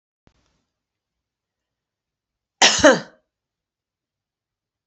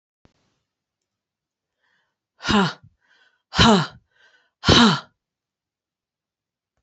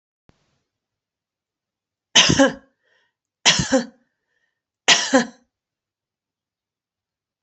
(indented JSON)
{
  "cough_length": "4.9 s",
  "cough_amplitude": 32767,
  "cough_signal_mean_std_ratio": 0.2,
  "exhalation_length": "6.8 s",
  "exhalation_amplitude": 27214,
  "exhalation_signal_mean_std_ratio": 0.28,
  "three_cough_length": "7.4 s",
  "three_cough_amplitude": 30236,
  "three_cough_signal_mean_std_ratio": 0.27,
  "survey_phase": "beta (2021-08-13 to 2022-03-07)",
  "age": "45-64",
  "gender": "Female",
  "wearing_mask": "No",
  "symptom_none": true,
  "smoker_status": "Never smoked",
  "respiratory_condition_asthma": false,
  "respiratory_condition_other": false,
  "recruitment_source": "REACT",
  "submission_delay": "2 days",
  "covid_test_result": "Negative",
  "covid_test_method": "RT-qPCR",
  "influenza_a_test_result": "Negative",
  "influenza_b_test_result": "Negative"
}